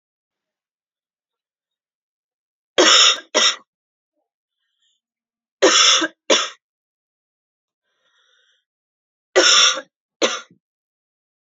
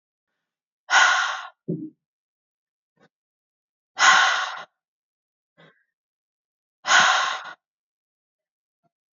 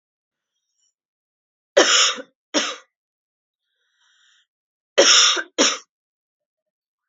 {
  "three_cough_length": "11.4 s",
  "three_cough_amplitude": 31012,
  "three_cough_signal_mean_std_ratio": 0.31,
  "exhalation_length": "9.1 s",
  "exhalation_amplitude": 25158,
  "exhalation_signal_mean_std_ratio": 0.33,
  "cough_length": "7.1 s",
  "cough_amplitude": 30396,
  "cough_signal_mean_std_ratio": 0.31,
  "survey_phase": "beta (2021-08-13 to 2022-03-07)",
  "age": "18-44",
  "gender": "Female",
  "wearing_mask": "No",
  "symptom_cough_any": true,
  "symptom_runny_or_blocked_nose": true,
  "symptom_sore_throat": true,
  "symptom_fatigue": true,
  "symptom_headache": true,
  "symptom_onset": "2 days",
  "smoker_status": "Never smoked",
  "respiratory_condition_asthma": false,
  "respiratory_condition_other": false,
  "recruitment_source": "Test and Trace",
  "submission_delay": "1 day",
  "covid_test_result": "Positive",
  "covid_test_method": "RT-qPCR",
  "covid_ct_value": 28.6,
  "covid_ct_gene": "ORF1ab gene"
}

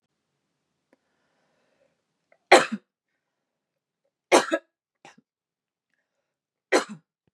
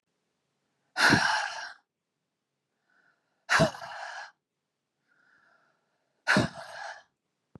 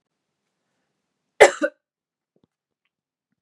{
  "three_cough_length": "7.3 s",
  "three_cough_amplitude": 31449,
  "three_cough_signal_mean_std_ratio": 0.17,
  "exhalation_length": "7.6 s",
  "exhalation_amplitude": 12241,
  "exhalation_signal_mean_std_ratio": 0.32,
  "cough_length": "3.4 s",
  "cough_amplitude": 32768,
  "cough_signal_mean_std_ratio": 0.15,
  "survey_phase": "beta (2021-08-13 to 2022-03-07)",
  "age": "18-44",
  "gender": "Female",
  "wearing_mask": "No",
  "symptom_cough_any": true,
  "symptom_runny_or_blocked_nose": true,
  "symptom_sore_throat": true,
  "symptom_headache": true,
  "smoker_status": "Never smoked",
  "respiratory_condition_asthma": false,
  "respiratory_condition_other": false,
  "recruitment_source": "Test and Trace",
  "submission_delay": "1 day",
  "covid_test_result": "Positive",
  "covid_test_method": "RT-qPCR",
  "covid_ct_value": 30.1,
  "covid_ct_gene": "ORF1ab gene",
  "covid_ct_mean": 30.3,
  "covid_viral_load": "110 copies/ml",
  "covid_viral_load_category": "Minimal viral load (< 10K copies/ml)"
}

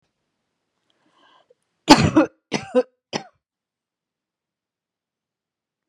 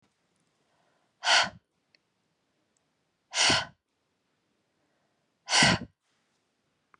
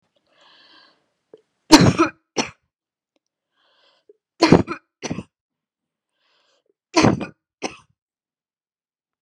{
  "cough_length": "5.9 s",
  "cough_amplitude": 32768,
  "cough_signal_mean_std_ratio": 0.21,
  "exhalation_length": "7.0 s",
  "exhalation_amplitude": 12434,
  "exhalation_signal_mean_std_ratio": 0.27,
  "three_cough_length": "9.2 s",
  "three_cough_amplitude": 32768,
  "three_cough_signal_mean_std_ratio": 0.23,
  "survey_phase": "beta (2021-08-13 to 2022-03-07)",
  "age": "45-64",
  "gender": "Female",
  "wearing_mask": "No",
  "symptom_none": true,
  "smoker_status": "Never smoked",
  "respiratory_condition_asthma": false,
  "respiratory_condition_other": false,
  "recruitment_source": "REACT",
  "submission_delay": "2 days",
  "covid_test_result": "Negative",
  "covid_test_method": "RT-qPCR"
}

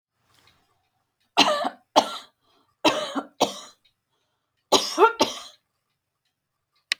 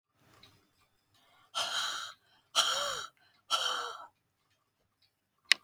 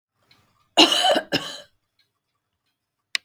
{
  "three_cough_length": "7.0 s",
  "three_cough_amplitude": 28384,
  "three_cough_signal_mean_std_ratio": 0.31,
  "exhalation_length": "5.6 s",
  "exhalation_amplitude": 26444,
  "exhalation_signal_mean_std_ratio": 0.37,
  "cough_length": "3.2 s",
  "cough_amplitude": 30455,
  "cough_signal_mean_std_ratio": 0.31,
  "survey_phase": "beta (2021-08-13 to 2022-03-07)",
  "age": "65+",
  "gender": "Female",
  "wearing_mask": "No",
  "symptom_none": true,
  "smoker_status": "Never smoked",
  "respiratory_condition_asthma": false,
  "respiratory_condition_other": false,
  "recruitment_source": "REACT",
  "submission_delay": "1 day",
  "covid_test_result": "Negative",
  "covid_test_method": "RT-qPCR"
}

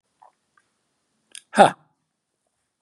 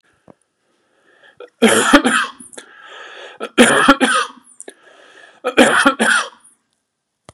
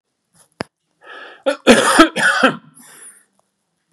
{
  "exhalation_length": "2.8 s",
  "exhalation_amplitude": 32739,
  "exhalation_signal_mean_std_ratio": 0.16,
  "three_cough_length": "7.3 s",
  "three_cough_amplitude": 32768,
  "three_cough_signal_mean_std_ratio": 0.42,
  "cough_length": "3.9 s",
  "cough_amplitude": 32768,
  "cough_signal_mean_std_ratio": 0.37,
  "survey_phase": "beta (2021-08-13 to 2022-03-07)",
  "age": "45-64",
  "gender": "Male",
  "wearing_mask": "No",
  "symptom_cough_any": true,
  "smoker_status": "Never smoked",
  "respiratory_condition_asthma": false,
  "respiratory_condition_other": false,
  "recruitment_source": "REACT",
  "submission_delay": "1 day",
  "covid_test_result": "Negative",
  "covid_test_method": "RT-qPCR"
}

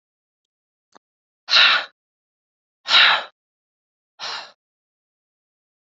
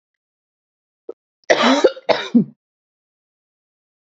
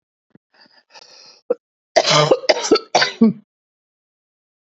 {
  "exhalation_length": "5.8 s",
  "exhalation_amplitude": 28685,
  "exhalation_signal_mean_std_ratio": 0.28,
  "cough_length": "4.0 s",
  "cough_amplitude": 32767,
  "cough_signal_mean_std_ratio": 0.31,
  "three_cough_length": "4.8 s",
  "three_cough_amplitude": 32767,
  "three_cough_signal_mean_std_ratio": 0.35,
  "survey_phase": "beta (2021-08-13 to 2022-03-07)",
  "age": "65+",
  "gender": "Female",
  "wearing_mask": "No",
  "symptom_cough_any": true,
  "symptom_runny_or_blocked_nose": true,
  "symptom_fatigue": true,
  "symptom_change_to_sense_of_smell_or_taste": true,
  "symptom_onset": "4 days",
  "smoker_status": "Ex-smoker",
  "respiratory_condition_asthma": false,
  "respiratory_condition_other": false,
  "recruitment_source": "Test and Trace",
  "submission_delay": "2 days",
  "covid_test_result": "Positive",
  "covid_test_method": "RT-qPCR",
  "covid_ct_value": 22.2,
  "covid_ct_gene": "N gene"
}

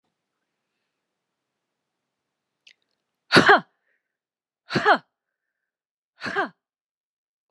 {
  "exhalation_length": "7.5 s",
  "exhalation_amplitude": 30992,
  "exhalation_signal_mean_std_ratio": 0.21,
  "survey_phase": "alpha (2021-03-01 to 2021-08-12)",
  "age": "45-64",
  "gender": "Female",
  "wearing_mask": "No",
  "symptom_none": true,
  "smoker_status": "Ex-smoker",
  "respiratory_condition_asthma": false,
  "respiratory_condition_other": false,
  "recruitment_source": "REACT",
  "submission_delay": "1 day",
  "covid_test_result": "Negative",
  "covid_test_method": "RT-qPCR"
}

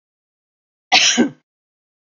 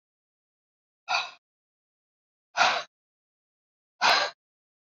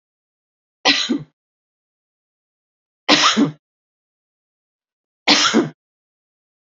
{
  "cough_length": "2.1 s",
  "cough_amplitude": 29636,
  "cough_signal_mean_std_ratio": 0.33,
  "exhalation_length": "4.9 s",
  "exhalation_amplitude": 13247,
  "exhalation_signal_mean_std_ratio": 0.28,
  "three_cough_length": "6.7 s",
  "three_cough_amplitude": 29894,
  "three_cough_signal_mean_std_ratio": 0.32,
  "survey_phase": "beta (2021-08-13 to 2022-03-07)",
  "age": "45-64",
  "gender": "Female",
  "wearing_mask": "No",
  "symptom_none": true,
  "smoker_status": "Never smoked",
  "respiratory_condition_asthma": false,
  "respiratory_condition_other": false,
  "recruitment_source": "REACT",
  "submission_delay": "2 days",
  "covid_test_result": "Negative",
  "covid_test_method": "RT-qPCR",
  "influenza_a_test_result": "Negative",
  "influenza_b_test_result": "Negative"
}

